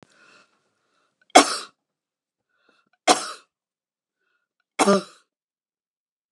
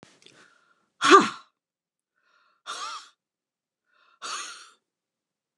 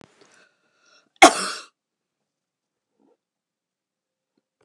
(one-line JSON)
{"three_cough_length": "6.3 s", "three_cough_amplitude": 29204, "three_cough_signal_mean_std_ratio": 0.2, "exhalation_length": "5.6 s", "exhalation_amplitude": 26236, "exhalation_signal_mean_std_ratio": 0.2, "cough_length": "4.6 s", "cough_amplitude": 29204, "cough_signal_mean_std_ratio": 0.14, "survey_phase": "beta (2021-08-13 to 2022-03-07)", "age": "65+", "gender": "Female", "wearing_mask": "No", "symptom_none": true, "smoker_status": "Never smoked", "respiratory_condition_asthma": false, "respiratory_condition_other": false, "recruitment_source": "REACT", "submission_delay": "1 day", "covid_test_result": "Negative", "covid_test_method": "RT-qPCR"}